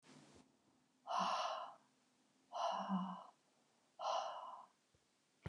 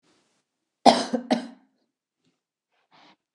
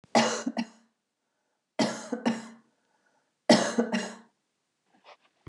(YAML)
exhalation_length: 5.5 s
exhalation_amplitude: 1266
exhalation_signal_mean_std_ratio: 0.52
cough_length: 3.3 s
cough_amplitude: 29109
cough_signal_mean_std_ratio: 0.22
three_cough_length: 5.5 s
three_cough_amplitude: 17477
three_cough_signal_mean_std_ratio: 0.36
survey_phase: beta (2021-08-13 to 2022-03-07)
age: 45-64
gender: Female
wearing_mask: 'No'
symptom_cough_any: true
symptom_runny_or_blocked_nose: true
symptom_shortness_of_breath: true
symptom_sore_throat: true
symptom_onset: 13 days
smoker_status: Never smoked
respiratory_condition_asthma: false
respiratory_condition_other: false
recruitment_source: REACT
submission_delay: 1 day
covid_test_result: Negative
covid_test_method: RT-qPCR
influenza_a_test_result: Negative
influenza_b_test_result: Negative